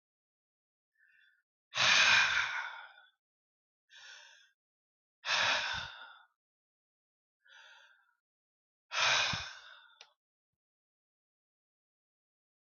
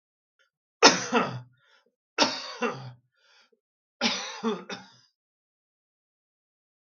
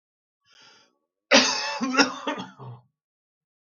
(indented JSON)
{
  "exhalation_length": "12.7 s",
  "exhalation_amplitude": 7627,
  "exhalation_signal_mean_std_ratio": 0.32,
  "three_cough_length": "6.9 s",
  "three_cough_amplitude": 32766,
  "three_cough_signal_mean_std_ratio": 0.29,
  "cough_length": "3.8 s",
  "cough_amplitude": 25798,
  "cough_signal_mean_std_ratio": 0.35,
  "survey_phase": "beta (2021-08-13 to 2022-03-07)",
  "age": "45-64",
  "gender": "Male",
  "wearing_mask": "No",
  "symptom_fatigue": true,
  "smoker_status": "Never smoked",
  "respiratory_condition_asthma": false,
  "respiratory_condition_other": false,
  "recruitment_source": "REACT",
  "submission_delay": "2 days",
  "covid_test_result": "Negative",
  "covid_test_method": "RT-qPCR",
  "influenza_a_test_result": "Negative",
  "influenza_b_test_result": "Negative"
}